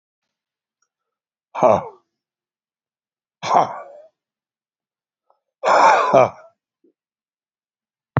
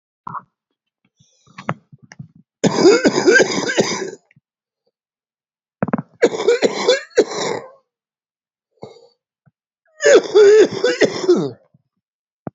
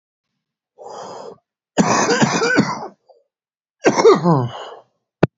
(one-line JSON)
{"exhalation_length": "8.2 s", "exhalation_amplitude": 28762, "exhalation_signal_mean_std_ratio": 0.29, "three_cough_length": "12.5 s", "three_cough_amplitude": 32767, "three_cough_signal_mean_std_ratio": 0.41, "cough_length": "5.4 s", "cough_amplitude": 29476, "cough_signal_mean_std_ratio": 0.46, "survey_phase": "beta (2021-08-13 to 2022-03-07)", "age": "65+", "gender": "Male", "wearing_mask": "No", "symptom_cough_any": true, "smoker_status": "Prefer not to say", "respiratory_condition_asthma": true, "respiratory_condition_other": true, "recruitment_source": "REACT", "submission_delay": "3 days", "covid_test_result": "Positive", "covid_test_method": "RT-qPCR", "covid_ct_value": 24.5, "covid_ct_gene": "E gene", "influenza_a_test_result": "Negative", "influenza_b_test_result": "Negative"}